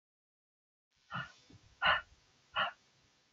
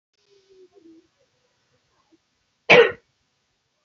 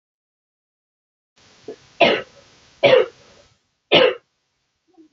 {"exhalation_length": "3.3 s", "exhalation_amplitude": 5023, "exhalation_signal_mean_std_ratio": 0.29, "cough_length": "3.8 s", "cough_amplitude": 32000, "cough_signal_mean_std_ratio": 0.19, "three_cough_length": "5.1 s", "three_cough_amplitude": 29689, "three_cough_signal_mean_std_ratio": 0.29, "survey_phase": "beta (2021-08-13 to 2022-03-07)", "age": "18-44", "gender": "Female", "wearing_mask": "No", "symptom_cough_any": true, "symptom_runny_or_blocked_nose": true, "symptom_fatigue": true, "symptom_headache": true, "symptom_change_to_sense_of_smell_or_taste": true, "symptom_other": true, "symptom_onset": "3 days", "smoker_status": "Never smoked", "respiratory_condition_asthma": false, "respiratory_condition_other": false, "recruitment_source": "Test and Trace", "submission_delay": "2 days", "covid_test_result": "Positive", "covid_test_method": "RT-qPCR", "covid_ct_value": 17.7, "covid_ct_gene": "ORF1ab gene", "covid_ct_mean": 18.2, "covid_viral_load": "1100000 copies/ml", "covid_viral_load_category": "High viral load (>1M copies/ml)"}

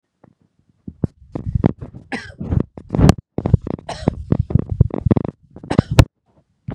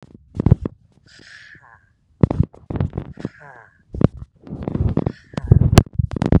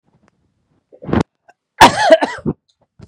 {"three_cough_length": "6.7 s", "three_cough_amplitude": 32768, "three_cough_signal_mean_std_ratio": 0.33, "exhalation_length": "6.4 s", "exhalation_amplitude": 32768, "exhalation_signal_mean_std_ratio": 0.32, "cough_length": "3.1 s", "cough_amplitude": 32768, "cough_signal_mean_std_ratio": 0.32, "survey_phase": "beta (2021-08-13 to 2022-03-07)", "age": "45-64", "gender": "Male", "wearing_mask": "No", "symptom_cough_any": true, "symptom_onset": "12 days", "smoker_status": "Never smoked", "respiratory_condition_asthma": false, "respiratory_condition_other": false, "recruitment_source": "REACT", "submission_delay": "2 days", "covid_test_result": "Negative", "covid_test_method": "RT-qPCR", "influenza_a_test_result": "Negative", "influenza_b_test_result": "Negative"}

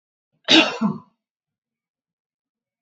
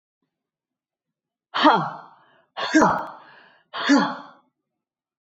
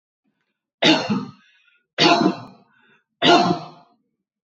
{"cough_length": "2.8 s", "cough_amplitude": 28425, "cough_signal_mean_std_ratio": 0.27, "exhalation_length": "5.2 s", "exhalation_amplitude": 24504, "exhalation_signal_mean_std_ratio": 0.36, "three_cough_length": "4.4 s", "three_cough_amplitude": 25554, "three_cough_signal_mean_std_ratio": 0.4, "survey_phase": "beta (2021-08-13 to 2022-03-07)", "age": "45-64", "gender": "Female", "wearing_mask": "No", "symptom_none": true, "smoker_status": "Never smoked", "respiratory_condition_asthma": false, "respiratory_condition_other": false, "recruitment_source": "Test and Trace", "submission_delay": "-1 day", "covid_test_result": "Negative", "covid_test_method": "LFT"}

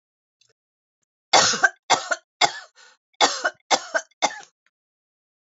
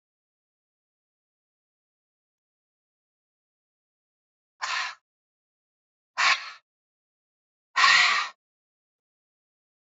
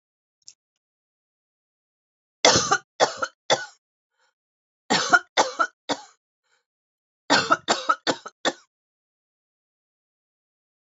{"cough_length": "5.5 s", "cough_amplitude": 28473, "cough_signal_mean_std_ratio": 0.32, "exhalation_length": "10.0 s", "exhalation_amplitude": 19313, "exhalation_signal_mean_std_ratio": 0.23, "three_cough_length": "10.9 s", "three_cough_amplitude": 27004, "three_cough_signal_mean_std_ratio": 0.29, "survey_phase": "alpha (2021-03-01 to 2021-08-12)", "age": "65+", "gender": "Female", "wearing_mask": "No", "symptom_none": true, "smoker_status": "Ex-smoker", "respiratory_condition_asthma": false, "respiratory_condition_other": false, "recruitment_source": "REACT", "submission_delay": "1 day", "covid_test_result": "Negative", "covid_test_method": "RT-qPCR"}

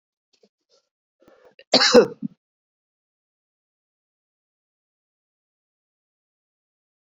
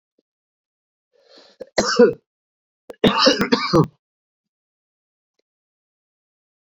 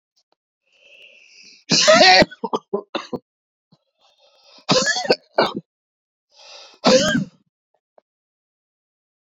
{"cough_length": "7.2 s", "cough_amplitude": 28655, "cough_signal_mean_std_ratio": 0.16, "three_cough_length": "6.7 s", "three_cough_amplitude": 28011, "three_cough_signal_mean_std_ratio": 0.29, "exhalation_length": "9.4 s", "exhalation_amplitude": 31057, "exhalation_signal_mean_std_ratio": 0.33, "survey_phase": "beta (2021-08-13 to 2022-03-07)", "age": "45-64", "gender": "Male", "wearing_mask": "No", "symptom_cough_any": true, "symptom_runny_or_blocked_nose": true, "symptom_sore_throat": true, "symptom_fatigue": true, "symptom_fever_high_temperature": true, "symptom_headache": true, "symptom_onset": "4 days", "smoker_status": "Ex-smoker", "respiratory_condition_asthma": false, "respiratory_condition_other": false, "recruitment_source": "Test and Trace", "submission_delay": "1 day", "covid_test_result": "Positive", "covid_test_method": "RT-qPCR", "covid_ct_value": 13.3, "covid_ct_gene": "ORF1ab gene", "covid_ct_mean": 14.1, "covid_viral_load": "24000000 copies/ml", "covid_viral_load_category": "High viral load (>1M copies/ml)"}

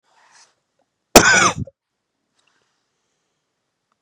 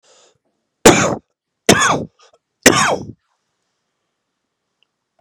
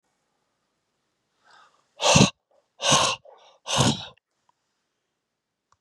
{"cough_length": "4.0 s", "cough_amplitude": 32768, "cough_signal_mean_std_ratio": 0.23, "three_cough_length": "5.2 s", "three_cough_amplitude": 32768, "three_cough_signal_mean_std_ratio": 0.31, "exhalation_length": "5.8 s", "exhalation_amplitude": 24476, "exhalation_signal_mean_std_ratio": 0.3, "survey_phase": "beta (2021-08-13 to 2022-03-07)", "age": "65+", "gender": "Female", "wearing_mask": "No", "symptom_cough_any": true, "symptom_runny_or_blocked_nose": true, "symptom_headache": true, "symptom_change_to_sense_of_smell_or_taste": true, "smoker_status": "Never smoked", "respiratory_condition_asthma": false, "respiratory_condition_other": false, "recruitment_source": "Test and Trace", "submission_delay": "3 days", "covid_test_result": "Positive", "covid_test_method": "LFT"}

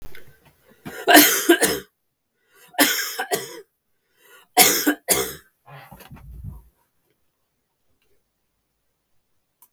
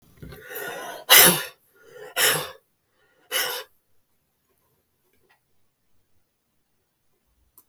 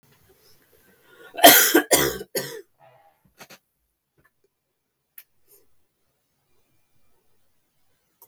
{"three_cough_length": "9.7 s", "three_cough_amplitude": 32768, "three_cough_signal_mean_std_ratio": 0.32, "exhalation_length": "7.7 s", "exhalation_amplitude": 32768, "exhalation_signal_mean_std_ratio": 0.26, "cough_length": "8.3 s", "cough_amplitude": 32768, "cough_signal_mean_std_ratio": 0.22, "survey_phase": "beta (2021-08-13 to 2022-03-07)", "age": "45-64", "gender": "Female", "wearing_mask": "No", "symptom_none": true, "smoker_status": "Never smoked", "respiratory_condition_asthma": false, "respiratory_condition_other": false, "recruitment_source": "REACT", "submission_delay": "2 days", "covid_test_result": "Negative", "covid_test_method": "RT-qPCR", "influenza_a_test_result": "Negative", "influenza_b_test_result": "Negative"}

